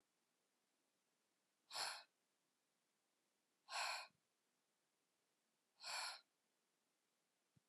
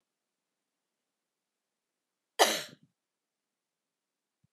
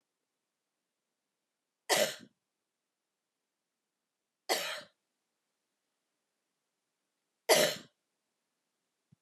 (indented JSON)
{
  "exhalation_length": "7.7 s",
  "exhalation_amplitude": 829,
  "exhalation_signal_mean_std_ratio": 0.3,
  "cough_length": "4.5 s",
  "cough_amplitude": 13685,
  "cough_signal_mean_std_ratio": 0.15,
  "three_cough_length": "9.2 s",
  "three_cough_amplitude": 10360,
  "three_cough_signal_mean_std_ratio": 0.21,
  "survey_phase": "beta (2021-08-13 to 2022-03-07)",
  "age": "45-64",
  "gender": "Female",
  "wearing_mask": "No",
  "symptom_none": true,
  "smoker_status": "Never smoked",
  "respiratory_condition_asthma": false,
  "respiratory_condition_other": false,
  "recruitment_source": "REACT",
  "submission_delay": "2 days",
  "covid_test_result": "Negative",
  "covid_test_method": "RT-qPCR"
}